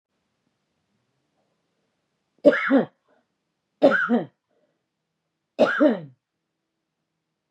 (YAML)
three_cough_length: 7.5 s
three_cough_amplitude: 25627
three_cough_signal_mean_std_ratio: 0.29
survey_phase: beta (2021-08-13 to 2022-03-07)
age: 45-64
gender: Female
wearing_mask: 'No'
symptom_runny_or_blocked_nose: true
symptom_fatigue: true
smoker_status: Ex-smoker
respiratory_condition_asthma: false
respiratory_condition_other: false
recruitment_source: REACT
submission_delay: 2 days
covid_test_result: Negative
covid_test_method: RT-qPCR
influenza_a_test_result: Negative
influenza_b_test_result: Negative